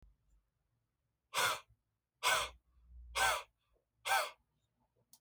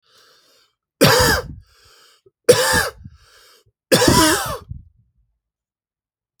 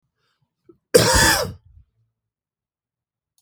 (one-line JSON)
{"exhalation_length": "5.2 s", "exhalation_amplitude": 3602, "exhalation_signal_mean_std_ratio": 0.36, "three_cough_length": "6.4 s", "three_cough_amplitude": 32768, "three_cough_signal_mean_std_ratio": 0.38, "cough_length": "3.4 s", "cough_amplitude": 32768, "cough_signal_mean_std_ratio": 0.31, "survey_phase": "beta (2021-08-13 to 2022-03-07)", "age": "18-44", "gender": "Male", "wearing_mask": "No", "symptom_none": true, "smoker_status": "Never smoked", "respiratory_condition_asthma": true, "respiratory_condition_other": false, "recruitment_source": "REACT", "submission_delay": "1 day", "covid_test_result": "Negative", "covid_test_method": "RT-qPCR", "influenza_a_test_result": "Negative", "influenza_b_test_result": "Negative"}